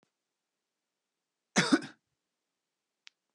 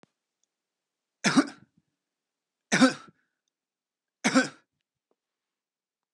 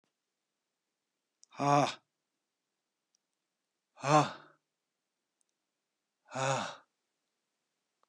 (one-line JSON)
{"cough_length": "3.3 s", "cough_amplitude": 9951, "cough_signal_mean_std_ratio": 0.19, "three_cough_length": "6.1 s", "three_cough_amplitude": 15916, "three_cough_signal_mean_std_ratio": 0.23, "exhalation_length": "8.1 s", "exhalation_amplitude": 8815, "exhalation_signal_mean_std_ratio": 0.23, "survey_phase": "beta (2021-08-13 to 2022-03-07)", "age": "45-64", "gender": "Male", "wearing_mask": "No", "symptom_none": true, "symptom_onset": "3 days", "smoker_status": "Ex-smoker", "respiratory_condition_asthma": false, "respiratory_condition_other": false, "recruitment_source": "REACT", "submission_delay": "2 days", "covid_test_result": "Negative", "covid_test_method": "RT-qPCR"}